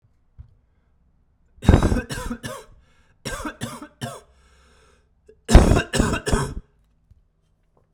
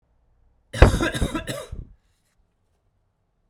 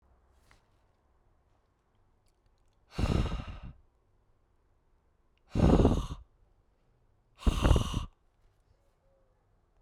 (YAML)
three_cough_length: 7.9 s
three_cough_amplitude: 32768
three_cough_signal_mean_std_ratio: 0.31
cough_length: 3.5 s
cough_amplitude: 32768
cough_signal_mean_std_ratio: 0.27
exhalation_length: 9.8 s
exhalation_amplitude: 11426
exhalation_signal_mean_std_ratio: 0.3
survey_phase: beta (2021-08-13 to 2022-03-07)
age: 18-44
gender: Male
wearing_mask: 'No'
symptom_cough_any: true
symptom_runny_or_blocked_nose: true
symptom_fatigue: true
symptom_fever_high_temperature: true
symptom_headache: true
symptom_onset: 3 days
smoker_status: Never smoked
respiratory_condition_asthma: false
respiratory_condition_other: false
recruitment_source: Test and Trace
submission_delay: 2 days
covid_test_result: Positive
covid_test_method: RT-qPCR
covid_ct_value: 17.7
covid_ct_gene: ORF1ab gene
covid_ct_mean: 18.9
covid_viral_load: 660000 copies/ml
covid_viral_load_category: Low viral load (10K-1M copies/ml)